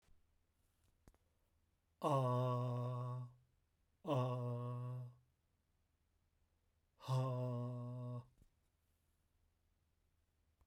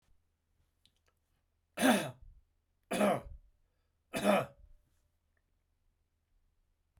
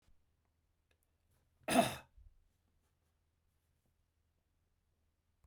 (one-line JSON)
{"exhalation_length": "10.7 s", "exhalation_amplitude": 1561, "exhalation_signal_mean_std_ratio": 0.51, "three_cough_length": "7.0 s", "three_cough_amplitude": 5725, "three_cough_signal_mean_std_ratio": 0.29, "cough_length": "5.5 s", "cough_amplitude": 5016, "cough_signal_mean_std_ratio": 0.17, "survey_phase": "beta (2021-08-13 to 2022-03-07)", "age": "45-64", "gender": "Male", "wearing_mask": "No", "symptom_shortness_of_breath": true, "symptom_fatigue": true, "symptom_headache": true, "symptom_onset": "12 days", "smoker_status": "Never smoked", "respiratory_condition_asthma": false, "respiratory_condition_other": false, "recruitment_source": "REACT", "submission_delay": "2 days", "covid_test_result": "Negative", "covid_test_method": "RT-qPCR", "influenza_a_test_result": "Negative", "influenza_b_test_result": "Negative"}